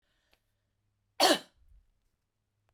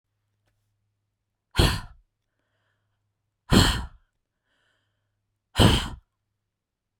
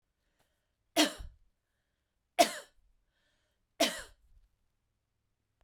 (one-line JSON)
{"cough_length": "2.7 s", "cough_amplitude": 10659, "cough_signal_mean_std_ratio": 0.21, "exhalation_length": "7.0 s", "exhalation_amplitude": 25623, "exhalation_signal_mean_std_ratio": 0.26, "three_cough_length": "5.6 s", "three_cough_amplitude": 11136, "three_cough_signal_mean_std_ratio": 0.21, "survey_phase": "beta (2021-08-13 to 2022-03-07)", "age": "65+", "gender": "Female", "wearing_mask": "No", "symptom_none": true, "smoker_status": "Ex-smoker", "respiratory_condition_asthma": false, "respiratory_condition_other": false, "recruitment_source": "REACT", "submission_delay": "1 day", "covid_test_result": "Negative", "covid_test_method": "RT-qPCR"}